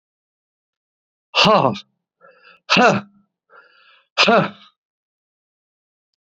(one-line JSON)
{"exhalation_length": "6.2 s", "exhalation_amplitude": 30291, "exhalation_signal_mean_std_ratio": 0.32, "survey_phase": "beta (2021-08-13 to 2022-03-07)", "age": "45-64", "gender": "Male", "wearing_mask": "No", "symptom_none": true, "smoker_status": "Ex-smoker", "respiratory_condition_asthma": false, "respiratory_condition_other": false, "recruitment_source": "REACT", "submission_delay": "1 day", "covid_test_result": "Negative", "covid_test_method": "RT-qPCR", "influenza_a_test_result": "Negative", "influenza_b_test_result": "Negative"}